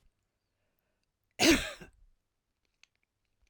{"cough_length": "3.5 s", "cough_amplitude": 9427, "cough_signal_mean_std_ratio": 0.22, "survey_phase": "alpha (2021-03-01 to 2021-08-12)", "age": "65+", "gender": "Female", "wearing_mask": "No", "symptom_none": true, "symptom_onset": "12 days", "smoker_status": "Never smoked", "respiratory_condition_asthma": false, "respiratory_condition_other": false, "recruitment_source": "REACT", "submission_delay": "1 day", "covid_test_result": "Negative", "covid_test_method": "RT-qPCR"}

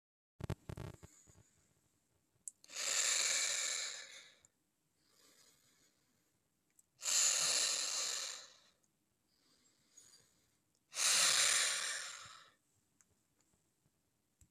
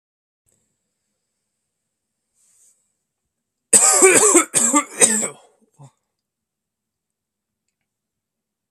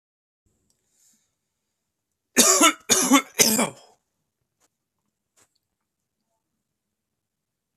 {"exhalation_length": "14.5 s", "exhalation_amplitude": 4291, "exhalation_signal_mean_std_ratio": 0.42, "cough_length": "8.7 s", "cough_amplitude": 32768, "cough_signal_mean_std_ratio": 0.3, "three_cough_length": "7.8 s", "three_cough_amplitude": 31576, "three_cough_signal_mean_std_ratio": 0.27, "survey_phase": "alpha (2021-03-01 to 2021-08-12)", "age": "18-44", "gender": "Male", "wearing_mask": "No", "symptom_cough_any": true, "symptom_fatigue": true, "symptom_headache": true, "smoker_status": "Current smoker (1 to 10 cigarettes per day)", "respiratory_condition_asthma": false, "respiratory_condition_other": false, "recruitment_source": "Test and Trace", "submission_delay": "1 day", "covid_test_result": "Positive", "covid_test_method": "RT-qPCR", "covid_ct_value": 13.6, "covid_ct_gene": "ORF1ab gene", "covid_ct_mean": 14.2, "covid_viral_load": "22000000 copies/ml", "covid_viral_load_category": "High viral load (>1M copies/ml)"}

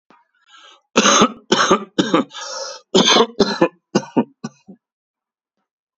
{"cough_length": "6.0 s", "cough_amplitude": 32767, "cough_signal_mean_std_ratio": 0.43, "survey_phase": "beta (2021-08-13 to 2022-03-07)", "age": "45-64", "gender": "Male", "wearing_mask": "No", "symptom_none": true, "smoker_status": "Ex-smoker", "respiratory_condition_asthma": false, "respiratory_condition_other": false, "recruitment_source": "REACT", "submission_delay": "1 day", "covid_test_result": "Negative", "covid_test_method": "RT-qPCR", "influenza_a_test_result": "Negative", "influenza_b_test_result": "Negative"}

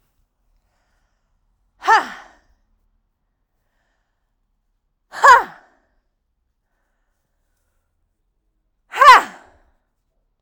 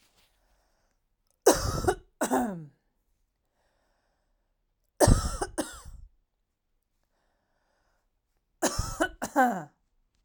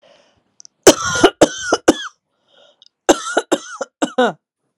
{"exhalation_length": "10.4 s", "exhalation_amplitude": 32768, "exhalation_signal_mean_std_ratio": 0.19, "three_cough_length": "10.2 s", "three_cough_amplitude": 20158, "three_cough_signal_mean_std_ratio": 0.31, "cough_length": "4.8 s", "cough_amplitude": 32768, "cough_signal_mean_std_ratio": 0.34, "survey_phase": "alpha (2021-03-01 to 2021-08-12)", "age": "18-44", "gender": "Female", "wearing_mask": "No", "symptom_fatigue": true, "symptom_headache": true, "smoker_status": "Never smoked", "respiratory_condition_asthma": false, "respiratory_condition_other": false, "recruitment_source": "Test and Trace", "submission_delay": "2 days", "covid_test_result": "Positive", "covid_test_method": "RT-qPCR", "covid_ct_value": 24.4, "covid_ct_gene": "ORF1ab gene", "covid_ct_mean": 25.0, "covid_viral_load": "6300 copies/ml", "covid_viral_load_category": "Minimal viral load (< 10K copies/ml)"}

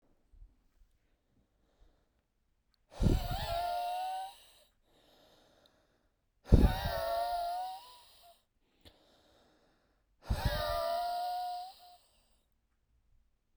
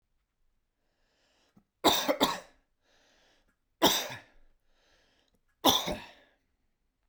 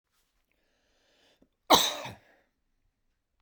{"exhalation_length": "13.6 s", "exhalation_amplitude": 12591, "exhalation_signal_mean_std_ratio": 0.4, "three_cough_length": "7.1 s", "three_cough_amplitude": 13310, "three_cough_signal_mean_std_ratio": 0.28, "cough_length": "3.4 s", "cough_amplitude": 21035, "cough_signal_mean_std_ratio": 0.2, "survey_phase": "beta (2021-08-13 to 2022-03-07)", "age": "18-44", "gender": "Male", "wearing_mask": "No", "symptom_none": true, "smoker_status": "Never smoked", "respiratory_condition_asthma": false, "respiratory_condition_other": false, "recruitment_source": "Test and Trace", "submission_delay": "-1 day", "covid_test_result": "Negative", "covid_test_method": "LFT"}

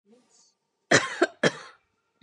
{"cough_length": "2.2 s", "cough_amplitude": 21537, "cough_signal_mean_std_ratio": 0.29, "survey_phase": "beta (2021-08-13 to 2022-03-07)", "age": "18-44", "gender": "Female", "wearing_mask": "No", "symptom_none": true, "smoker_status": "Ex-smoker", "respiratory_condition_asthma": false, "respiratory_condition_other": false, "recruitment_source": "REACT", "submission_delay": "1 day", "covid_test_result": "Negative", "covid_test_method": "RT-qPCR", "influenza_a_test_result": "Negative", "influenza_b_test_result": "Negative"}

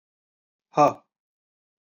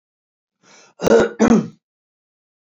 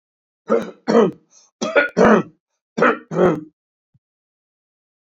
{"exhalation_length": "2.0 s", "exhalation_amplitude": 17215, "exhalation_signal_mean_std_ratio": 0.21, "cough_length": "2.7 s", "cough_amplitude": 27861, "cough_signal_mean_std_ratio": 0.35, "three_cough_length": "5.0 s", "three_cough_amplitude": 26732, "three_cough_signal_mean_std_ratio": 0.4, "survey_phase": "beta (2021-08-13 to 2022-03-07)", "age": "65+", "gender": "Male", "wearing_mask": "No", "symptom_none": true, "smoker_status": "Ex-smoker", "respiratory_condition_asthma": false, "respiratory_condition_other": false, "recruitment_source": "REACT", "submission_delay": "2 days", "covid_test_result": "Negative", "covid_test_method": "RT-qPCR", "influenza_a_test_result": "Negative", "influenza_b_test_result": "Negative"}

